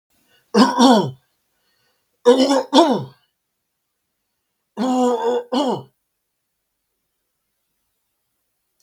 {"three_cough_length": "8.8 s", "three_cough_amplitude": 32768, "three_cough_signal_mean_std_ratio": 0.39, "survey_phase": "beta (2021-08-13 to 2022-03-07)", "age": "65+", "gender": "Male", "wearing_mask": "No", "symptom_none": true, "smoker_status": "Ex-smoker", "respiratory_condition_asthma": false, "respiratory_condition_other": false, "recruitment_source": "REACT", "submission_delay": "2 days", "covid_test_result": "Negative", "covid_test_method": "RT-qPCR", "influenza_a_test_result": "Negative", "influenza_b_test_result": "Negative"}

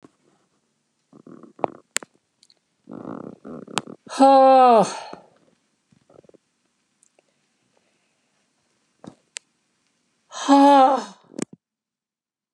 {"exhalation_length": "12.5 s", "exhalation_amplitude": 32767, "exhalation_signal_mean_std_ratio": 0.28, "survey_phase": "beta (2021-08-13 to 2022-03-07)", "age": "65+", "gender": "Female", "wearing_mask": "No", "symptom_none": true, "smoker_status": "Never smoked", "respiratory_condition_asthma": false, "respiratory_condition_other": false, "recruitment_source": "REACT", "submission_delay": "3 days", "covid_test_result": "Negative", "covid_test_method": "RT-qPCR", "influenza_a_test_result": "Negative", "influenza_b_test_result": "Negative"}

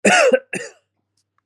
{"cough_length": "1.5 s", "cough_amplitude": 27417, "cough_signal_mean_std_ratio": 0.45, "survey_phase": "beta (2021-08-13 to 2022-03-07)", "age": "18-44", "gender": "Male", "wearing_mask": "No", "symptom_none": true, "symptom_onset": "12 days", "smoker_status": "Never smoked", "respiratory_condition_asthma": false, "respiratory_condition_other": false, "recruitment_source": "REACT", "submission_delay": "19 days", "covid_test_result": "Negative", "covid_test_method": "RT-qPCR"}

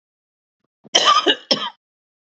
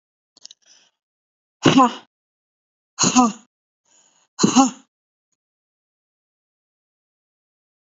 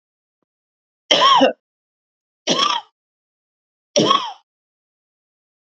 {"cough_length": "2.4 s", "cough_amplitude": 29768, "cough_signal_mean_std_ratio": 0.36, "exhalation_length": "7.9 s", "exhalation_amplitude": 28798, "exhalation_signal_mean_std_ratio": 0.25, "three_cough_length": "5.6 s", "three_cough_amplitude": 31597, "three_cough_signal_mean_std_ratio": 0.34, "survey_phase": "alpha (2021-03-01 to 2021-08-12)", "age": "45-64", "gender": "Female", "wearing_mask": "No", "symptom_none": true, "smoker_status": "Ex-smoker", "respiratory_condition_asthma": false, "respiratory_condition_other": false, "recruitment_source": "REACT", "submission_delay": "2 days", "covid_test_result": "Negative", "covid_test_method": "RT-qPCR"}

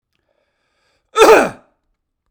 {"cough_length": "2.3 s", "cough_amplitude": 32768, "cough_signal_mean_std_ratio": 0.3, "survey_phase": "beta (2021-08-13 to 2022-03-07)", "age": "45-64", "gender": "Male", "wearing_mask": "No", "symptom_none": true, "smoker_status": "Ex-smoker", "respiratory_condition_asthma": false, "respiratory_condition_other": false, "recruitment_source": "REACT", "submission_delay": "4 days", "covid_test_result": "Negative", "covid_test_method": "RT-qPCR"}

